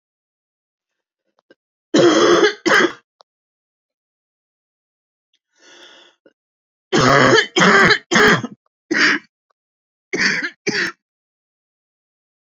{
  "three_cough_length": "12.5 s",
  "three_cough_amplitude": 30239,
  "three_cough_signal_mean_std_ratio": 0.4,
  "survey_phase": "beta (2021-08-13 to 2022-03-07)",
  "age": "45-64",
  "gender": "Female",
  "wearing_mask": "No",
  "symptom_cough_any": true,
  "symptom_runny_or_blocked_nose": true,
  "symptom_shortness_of_breath": true,
  "symptom_sore_throat": true,
  "symptom_fatigue": true,
  "symptom_headache": true,
  "symptom_change_to_sense_of_smell_or_taste": true,
  "symptom_onset": "7 days",
  "smoker_status": "Never smoked",
  "respiratory_condition_asthma": true,
  "respiratory_condition_other": true,
  "recruitment_source": "Test and Trace",
  "submission_delay": "2 days",
  "covid_test_result": "Positive",
  "covid_test_method": "ePCR"
}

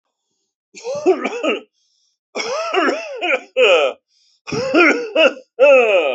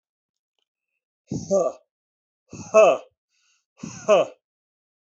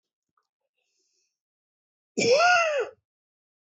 {
  "three_cough_length": "6.1 s",
  "three_cough_amplitude": 31123,
  "three_cough_signal_mean_std_ratio": 0.6,
  "exhalation_length": "5.0 s",
  "exhalation_amplitude": 20886,
  "exhalation_signal_mean_std_ratio": 0.31,
  "cough_length": "3.8 s",
  "cough_amplitude": 11081,
  "cough_signal_mean_std_ratio": 0.36,
  "survey_phase": "alpha (2021-03-01 to 2021-08-12)",
  "age": "65+",
  "gender": "Male",
  "wearing_mask": "No",
  "symptom_none": true,
  "smoker_status": "Ex-smoker",
  "respiratory_condition_asthma": false,
  "respiratory_condition_other": false,
  "recruitment_source": "REACT",
  "submission_delay": "2 days",
  "covid_test_result": "Negative",
  "covid_test_method": "RT-qPCR"
}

